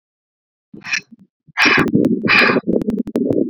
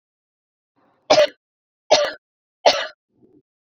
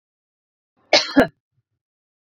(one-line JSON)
{"exhalation_length": "3.5 s", "exhalation_amplitude": 29846, "exhalation_signal_mean_std_ratio": 0.61, "three_cough_length": "3.7 s", "three_cough_amplitude": 30996, "three_cough_signal_mean_std_ratio": 0.29, "cough_length": "2.3 s", "cough_amplitude": 28812, "cough_signal_mean_std_ratio": 0.24, "survey_phase": "beta (2021-08-13 to 2022-03-07)", "age": "18-44", "gender": "Female", "wearing_mask": "No", "symptom_fatigue": true, "symptom_onset": "12 days", "smoker_status": "Ex-smoker", "respiratory_condition_asthma": false, "respiratory_condition_other": false, "recruitment_source": "REACT", "submission_delay": "2 days", "covid_test_result": "Negative", "covid_test_method": "RT-qPCR"}